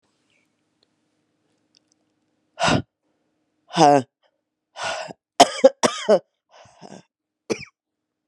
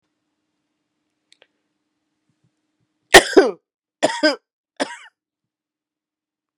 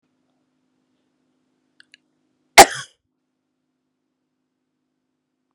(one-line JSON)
{"exhalation_length": "8.3 s", "exhalation_amplitude": 32768, "exhalation_signal_mean_std_ratio": 0.25, "three_cough_length": "6.6 s", "three_cough_amplitude": 32768, "three_cough_signal_mean_std_ratio": 0.19, "cough_length": "5.5 s", "cough_amplitude": 32768, "cough_signal_mean_std_ratio": 0.11, "survey_phase": "beta (2021-08-13 to 2022-03-07)", "age": "45-64", "gender": "Female", "wearing_mask": "No", "symptom_cough_any": true, "symptom_new_continuous_cough": true, "symptom_runny_or_blocked_nose": true, "symptom_abdominal_pain": true, "symptom_diarrhoea": true, "symptom_fatigue": true, "symptom_fever_high_temperature": true, "symptom_headache": true, "symptom_change_to_sense_of_smell_or_taste": true, "symptom_loss_of_taste": true, "symptom_other": true, "symptom_onset": "3 days", "smoker_status": "Never smoked", "respiratory_condition_asthma": false, "respiratory_condition_other": false, "recruitment_source": "Test and Trace", "submission_delay": "2 days", "covid_test_result": "Positive", "covid_test_method": "RT-qPCR", "covid_ct_value": 19.2, "covid_ct_gene": "ORF1ab gene", "covid_ct_mean": 19.9, "covid_viral_load": "300000 copies/ml", "covid_viral_load_category": "Low viral load (10K-1M copies/ml)"}